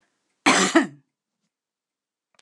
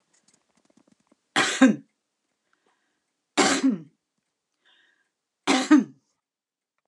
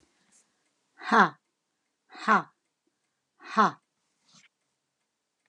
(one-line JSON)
{"cough_length": "2.4 s", "cough_amplitude": 25813, "cough_signal_mean_std_ratio": 0.3, "three_cough_length": "6.9 s", "three_cough_amplitude": 26092, "three_cough_signal_mean_std_ratio": 0.3, "exhalation_length": "5.5 s", "exhalation_amplitude": 16142, "exhalation_signal_mean_std_ratio": 0.23, "survey_phase": "alpha (2021-03-01 to 2021-08-12)", "age": "65+", "gender": "Female", "wearing_mask": "No", "symptom_none": true, "smoker_status": "Ex-smoker", "respiratory_condition_asthma": false, "respiratory_condition_other": false, "recruitment_source": "REACT", "submission_delay": "1 day", "covid_test_result": "Negative", "covid_test_method": "RT-qPCR"}